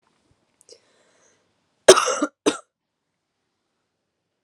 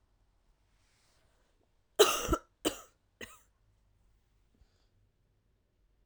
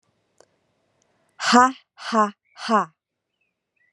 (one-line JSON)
{"cough_length": "4.4 s", "cough_amplitude": 32768, "cough_signal_mean_std_ratio": 0.19, "three_cough_length": "6.1 s", "three_cough_amplitude": 12919, "three_cough_signal_mean_std_ratio": 0.19, "exhalation_length": "3.9 s", "exhalation_amplitude": 30729, "exhalation_signal_mean_std_ratio": 0.31, "survey_phase": "alpha (2021-03-01 to 2021-08-12)", "age": "18-44", "gender": "Female", "wearing_mask": "No", "symptom_cough_any": true, "symptom_abdominal_pain": true, "symptom_fatigue": true, "symptom_fever_high_temperature": true, "symptom_headache": true, "symptom_change_to_sense_of_smell_or_taste": true, "symptom_onset": "3 days", "smoker_status": "Never smoked", "respiratory_condition_asthma": false, "respiratory_condition_other": false, "recruitment_source": "Test and Trace", "submission_delay": "2 days", "covid_test_result": "Positive", "covid_test_method": "RT-qPCR"}